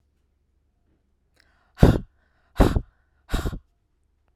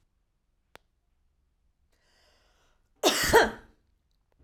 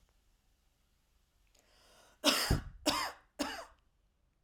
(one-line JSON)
{"exhalation_length": "4.4 s", "exhalation_amplitude": 32768, "exhalation_signal_mean_std_ratio": 0.24, "cough_length": "4.4 s", "cough_amplitude": 16755, "cough_signal_mean_std_ratio": 0.24, "three_cough_length": "4.4 s", "three_cough_amplitude": 6581, "three_cough_signal_mean_std_ratio": 0.34, "survey_phase": "beta (2021-08-13 to 2022-03-07)", "age": "45-64", "gender": "Female", "wearing_mask": "No", "symptom_none": true, "smoker_status": "Never smoked", "respiratory_condition_asthma": false, "respiratory_condition_other": false, "recruitment_source": "REACT", "submission_delay": "2 days", "covid_test_result": "Negative", "covid_test_method": "RT-qPCR", "influenza_a_test_result": "Unknown/Void", "influenza_b_test_result": "Unknown/Void"}